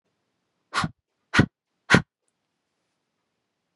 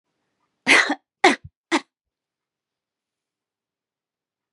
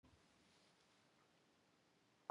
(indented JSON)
{
  "exhalation_length": "3.8 s",
  "exhalation_amplitude": 31817,
  "exhalation_signal_mean_std_ratio": 0.21,
  "three_cough_length": "4.5 s",
  "three_cough_amplitude": 30181,
  "three_cough_signal_mean_std_ratio": 0.23,
  "cough_length": "2.3 s",
  "cough_amplitude": 963,
  "cough_signal_mean_std_ratio": 0.27,
  "survey_phase": "beta (2021-08-13 to 2022-03-07)",
  "age": "45-64",
  "gender": "Female",
  "wearing_mask": "No",
  "symptom_none": true,
  "smoker_status": "Ex-smoker",
  "respiratory_condition_asthma": false,
  "respiratory_condition_other": false,
  "recruitment_source": "REACT",
  "submission_delay": "1 day",
  "covid_test_result": "Negative",
  "covid_test_method": "RT-qPCR",
  "influenza_a_test_result": "Negative",
  "influenza_b_test_result": "Negative"
}